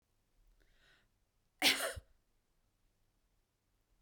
{"cough_length": "4.0 s", "cough_amplitude": 5437, "cough_signal_mean_std_ratio": 0.21, "survey_phase": "beta (2021-08-13 to 2022-03-07)", "age": "65+", "gender": "Female", "wearing_mask": "No", "symptom_none": true, "smoker_status": "Never smoked", "respiratory_condition_asthma": false, "respiratory_condition_other": false, "recruitment_source": "REACT", "submission_delay": "1 day", "covid_test_result": "Negative", "covid_test_method": "RT-qPCR", "influenza_a_test_result": "Negative", "influenza_b_test_result": "Negative"}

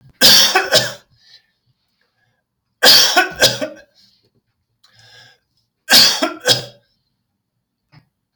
{"three_cough_length": "8.4 s", "three_cough_amplitude": 32768, "three_cough_signal_mean_std_ratio": 0.37, "survey_phase": "alpha (2021-03-01 to 2021-08-12)", "age": "45-64", "gender": "Male", "wearing_mask": "No", "symptom_none": true, "smoker_status": "Ex-smoker", "respiratory_condition_asthma": false, "respiratory_condition_other": false, "recruitment_source": "REACT", "submission_delay": "2 days", "covid_test_result": "Negative", "covid_test_method": "RT-qPCR"}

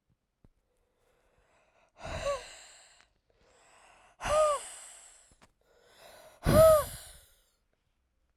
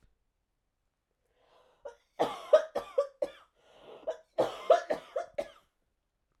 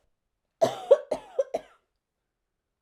{"exhalation_length": "8.4 s", "exhalation_amplitude": 12097, "exhalation_signal_mean_std_ratio": 0.28, "cough_length": "6.4 s", "cough_amplitude": 10301, "cough_signal_mean_std_ratio": 0.29, "three_cough_length": "2.8 s", "three_cough_amplitude": 16757, "three_cough_signal_mean_std_ratio": 0.25, "survey_phase": "beta (2021-08-13 to 2022-03-07)", "age": "18-44", "gender": "Female", "wearing_mask": "No", "symptom_cough_any": true, "symptom_new_continuous_cough": true, "symptom_runny_or_blocked_nose": true, "symptom_shortness_of_breath": true, "symptom_fatigue": true, "symptom_headache": true, "symptom_onset": "2 days", "smoker_status": "Never smoked", "respiratory_condition_asthma": false, "respiratory_condition_other": false, "recruitment_source": "Test and Trace", "submission_delay": "2 days", "covid_test_result": "Positive", "covid_test_method": "RT-qPCR"}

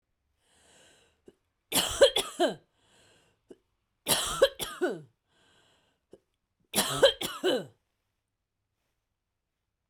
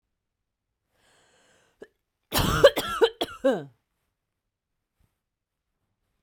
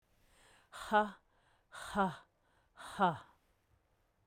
{"three_cough_length": "9.9 s", "three_cough_amplitude": 13162, "three_cough_signal_mean_std_ratio": 0.31, "cough_length": "6.2 s", "cough_amplitude": 25493, "cough_signal_mean_std_ratio": 0.25, "exhalation_length": "4.3 s", "exhalation_amplitude": 3920, "exhalation_signal_mean_std_ratio": 0.32, "survey_phase": "beta (2021-08-13 to 2022-03-07)", "age": "45-64", "gender": "Female", "wearing_mask": "No", "symptom_cough_any": true, "symptom_sore_throat": true, "symptom_fatigue": true, "symptom_headache": true, "smoker_status": "Never smoked", "respiratory_condition_asthma": false, "respiratory_condition_other": false, "recruitment_source": "REACT", "submission_delay": "1 day", "covid_test_result": "Negative", "covid_test_method": "RT-qPCR"}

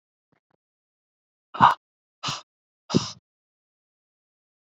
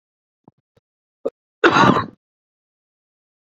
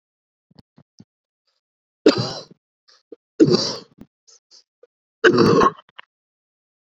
{"exhalation_length": "4.8 s", "exhalation_amplitude": 32768, "exhalation_signal_mean_std_ratio": 0.18, "cough_length": "3.6 s", "cough_amplitude": 28667, "cough_signal_mean_std_ratio": 0.26, "three_cough_length": "6.8 s", "three_cough_amplitude": 28078, "three_cough_signal_mean_std_ratio": 0.3, "survey_phase": "beta (2021-08-13 to 2022-03-07)", "age": "18-44", "gender": "Male", "wearing_mask": "No", "symptom_runny_or_blocked_nose": true, "symptom_fatigue": true, "symptom_headache": true, "symptom_onset": "4 days", "smoker_status": "Ex-smoker", "respiratory_condition_asthma": false, "respiratory_condition_other": false, "recruitment_source": "Test and Trace", "submission_delay": "2 days", "covid_test_result": "Positive", "covid_test_method": "RT-qPCR"}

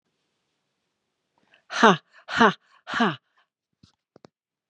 {"exhalation_length": "4.7 s", "exhalation_amplitude": 30983, "exhalation_signal_mean_std_ratio": 0.25, "survey_phase": "beta (2021-08-13 to 2022-03-07)", "age": "45-64", "gender": "Female", "wearing_mask": "No", "symptom_none": true, "smoker_status": "Ex-smoker", "respiratory_condition_asthma": false, "respiratory_condition_other": false, "recruitment_source": "REACT", "submission_delay": "1 day", "covid_test_result": "Negative", "covid_test_method": "RT-qPCR"}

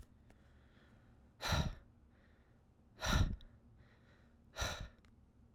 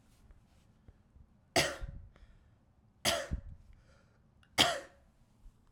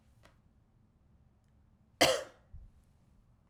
{"exhalation_length": "5.5 s", "exhalation_amplitude": 2452, "exhalation_signal_mean_std_ratio": 0.37, "three_cough_length": "5.7 s", "three_cough_amplitude": 9586, "three_cough_signal_mean_std_ratio": 0.31, "cough_length": "3.5 s", "cough_amplitude": 8211, "cough_signal_mean_std_ratio": 0.22, "survey_phase": "alpha (2021-03-01 to 2021-08-12)", "age": "18-44", "gender": "Male", "wearing_mask": "No", "symptom_none": true, "smoker_status": "Ex-smoker", "respiratory_condition_asthma": true, "respiratory_condition_other": false, "recruitment_source": "REACT", "submission_delay": "3 days", "covid_test_result": "Negative", "covid_test_method": "RT-qPCR"}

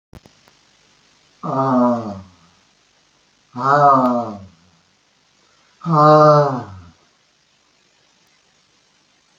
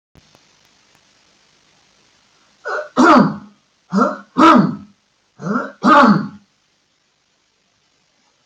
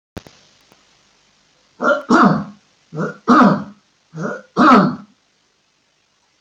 {"exhalation_length": "9.4 s", "exhalation_amplitude": 28400, "exhalation_signal_mean_std_ratio": 0.39, "cough_length": "8.5 s", "cough_amplitude": 31209, "cough_signal_mean_std_ratio": 0.36, "three_cough_length": "6.4 s", "three_cough_amplitude": 29515, "three_cough_signal_mean_std_ratio": 0.39, "survey_phase": "alpha (2021-03-01 to 2021-08-12)", "age": "65+", "gender": "Male", "wearing_mask": "No", "symptom_none": true, "smoker_status": "Never smoked", "respiratory_condition_asthma": false, "respiratory_condition_other": false, "recruitment_source": "REACT", "submission_delay": "2 days", "covid_test_result": "Negative", "covid_test_method": "RT-qPCR"}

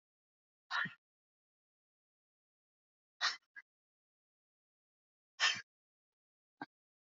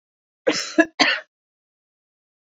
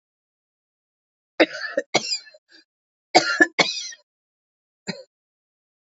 {"exhalation_length": "7.1 s", "exhalation_amplitude": 3564, "exhalation_signal_mean_std_ratio": 0.2, "cough_length": "2.5 s", "cough_amplitude": 26685, "cough_signal_mean_std_ratio": 0.3, "three_cough_length": "5.8 s", "three_cough_amplitude": 29221, "three_cough_signal_mean_std_ratio": 0.27, "survey_phase": "beta (2021-08-13 to 2022-03-07)", "age": "65+", "gender": "Female", "wearing_mask": "No", "symptom_cough_any": true, "smoker_status": "Never smoked", "respiratory_condition_asthma": false, "respiratory_condition_other": false, "recruitment_source": "REACT", "submission_delay": "17 days", "covid_test_result": "Negative", "covid_test_method": "RT-qPCR", "influenza_a_test_result": "Negative", "influenza_b_test_result": "Negative"}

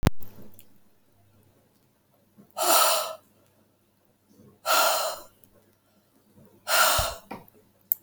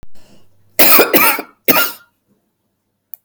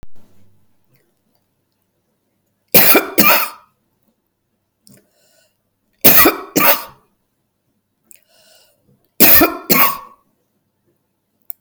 {"exhalation_length": "8.0 s", "exhalation_amplitude": 24514, "exhalation_signal_mean_std_ratio": 0.4, "cough_length": "3.2 s", "cough_amplitude": 32768, "cough_signal_mean_std_ratio": 0.43, "three_cough_length": "11.6 s", "three_cough_amplitude": 32768, "three_cough_signal_mean_std_ratio": 0.32, "survey_phase": "alpha (2021-03-01 to 2021-08-12)", "age": "65+", "gender": "Female", "wearing_mask": "No", "symptom_none": true, "smoker_status": "Ex-smoker", "respiratory_condition_asthma": false, "respiratory_condition_other": false, "recruitment_source": "REACT", "submission_delay": "2 days", "covid_test_result": "Negative", "covid_test_method": "RT-qPCR"}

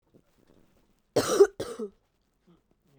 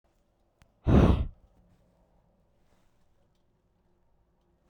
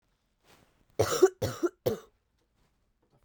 {"cough_length": "3.0 s", "cough_amplitude": 14251, "cough_signal_mean_std_ratio": 0.26, "exhalation_length": "4.7 s", "exhalation_amplitude": 12533, "exhalation_signal_mean_std_ratio": 0.24, "three_cough_length": "3.2 s", "three_cough_amplitude": 11217, "three_cough_signal_mean_std_ratio": 0.29, "survey_phase": "beta (2021-08-13 to 2022-03-07)", "age": "18-44", "gender": "Female", "wearing_mask": "No", "symptom_cough_any": true, "symptom_runny_or_blocked_nose": true, "symptom_shortness_of_breath": true, "symptom_fatigue": true, "symptom_headache": true, "smoker_status": "Current smoker (1 to 10 cigarettes per day)", "respiratory_condition_asthma": false, "respiratory_condition_other": false, "recruitment_source": "Test and Trace", "submission_delay": "2 days", "covid_test_result": "Positive", "covid_test_method": "ePCR"}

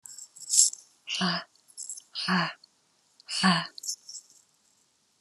{"exhalation_length": "5.2 s", "exhalation_amplitude": 23411, "exhalation_signal_mean_std_ratio": 0.4, "survey_phase": "beta (2021-08-13 to 2022-03-07)", "age": "65+", "gender": "Female", "wearing_mask": "No", "symptom_none": true, "smoker_status": "Never smoked", "respiratory_condition_asthma": true, "respiratory_condition_other": false, "recruitment_source": "REACT", "submission_delay": "1 day", "covid_test_result": "Negative", "covid_test_method": "RT-qPCR"}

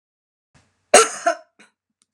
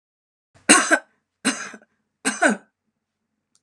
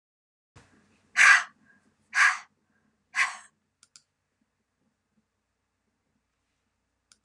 {"cough_length": "2.1 s", "cough_amplitude": 32768, "cough_signal_mean_std_ratio": 0.25, "three_cough_length": "3.6 s", "three_cough_amplitude": 31058, "three_cough_signal_mean_std_ratio": 0.31, "exhalation_length": "7.2 s", "exhalation_amplitude": 18469, "exhalation_signal_mean_std_ratio": 0.22, "survey_phase": "alpha (2021-03-01 to 2021-08-12)", "age": "45-64", "gender": "Female", "wearing_mask": "No", "symptom_none": true, "smoker_status": "Never smoked", "respiratory_condition_asthma": true, "respiratory_condition_other": false, "recruitment_source": "REACT", "submission_delay": "2 days", "covid_test_result": "Negative", "covid_test_method": "RT-qPCR"}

